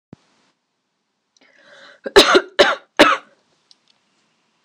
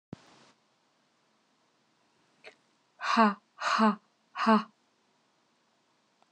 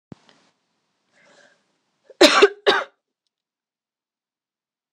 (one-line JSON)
{"three_cough_length": "4.6 s", "three_cough_amplitude": 26028, "three_cough_signal_mean_std_ratio": 0.28, "exhalation_length": "6.3 s", "exhalation_amplitude": 11344, "exhalation_signal_mean_std_ratio": 0.29, "cough_length": "4.9 s", "cough_amplitude": 26028, "cough_signal_mean_std_ratio": 0.22, "survey_phase": "alpha (2021-03-01 to 2021-08-12)", "age": "18-44", "gender": "Female", "wearing_mask": "No", "symptom_none": true, "smoker_status": "Never smoked", "respiratory_condition_asthma": false, "respiratory_condition_other": false, "recruitment_source": "REACT", "submission_delay": "1 day", "covid_test_result": "Negative", "covid_test_method": "RT-qPCR"}